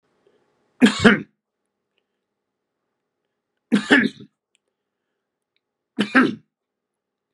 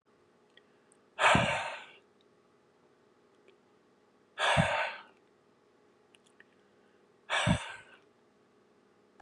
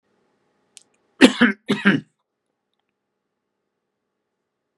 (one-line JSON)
{"three_cough_length": "7.3 s", "three_cough_amplitude": 32767, "three_cough_signal_mean_std_ratio": 0.25, "exhalation_length": "9.2 s", "exhalation_amplitude": 8417, "exhalation_signal_mean_std_ratio": 0.32, "cough_length": "4.8 s", "cough_amplitude": 32768, "cough_signal_mean_std_ratio": 0.22, "survey_phase": "beta (2021-08-13 to 2022-03-07)", "age": "65+", "gender": "Male", "wearing_mask": "No", "symptom_none": true, "smoker_status": "Ex-smoker", "respiratory_condition_asthma": false, "respiratory_condition_other": false, "recruitment_source": "REACT", "submission_delay": "2 days", "covid_test_result": "Negative", "covid_test_method": "RT-qPCR", "influenza_a_test_result": "Negative", "influenza_b_test_result": "Negative"}